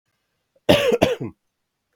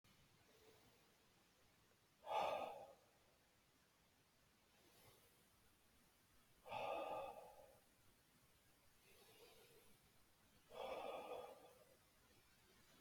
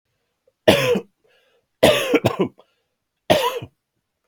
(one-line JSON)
{"cough_length": "2.0 s", "cough_amplitude": 32768, "cough_signal_mean_std_ratio": 0.38, "exhalation_length": "13.0 s", "exhalation_amplitude": 812, "exhalation_signal_mean_std_ratio": 0.42, "three_cough_length": "4.3 s", "three_cough_amplitude": 32767, "three_cough_signal_mean_std_ratio": 0.39, "survey_phase": "beta (2021-08-13 to 2022-03-07)", "age": "18-44", "gender": "Male", "wearing_mask": "No", "symptom_none": true, "smoker_status": "Ex-smoker", "respiratory_condition_asthma": false, "respiratory_condition_other": false, "recruitment_source": "REACT", "submission_delay": "1 day", "covid_test_result": "Negative", "covid_test_method": "RT-qPCR", "influenza_a_test_result": "Negative", "influenza_b_test_result": "Negative"}